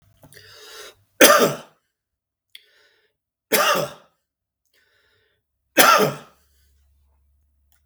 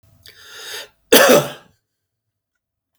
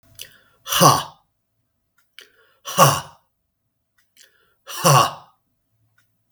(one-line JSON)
{"three_cough_length": "7.9 s", "three_cough_amplitude": 32768, "three_cough_signal_mean_std_ratio": 0.28, "cough_length": "3.0 s", "cough_amplitude": 32768, "cough_signal_mean_std_ratio": 0.3, "exhalation_length": "6.3 s", "exhalation_amplitude": 32768, "exhalation_signal_mean_std_ratio": 0.29, "survey_phase": "beta (2021-08-13 to 2022-03-07)", "age": "45-64", "gender": "Male", "wearing_mask": "No", "symptom_none": true, "symptom_onset": "9 days", "smoker_status": "Ex-smoker", "respiratory_condition_asthma": false, "respiratory_condition_other": true, "recruitment_source": "REACT", "submission_delay": "5 days", "covid_test_result": "Negative", "covid_test_method": "RT-qPCR", "influenza_a_test_result": "Negative", "influenza_b_test_result": "Negative"}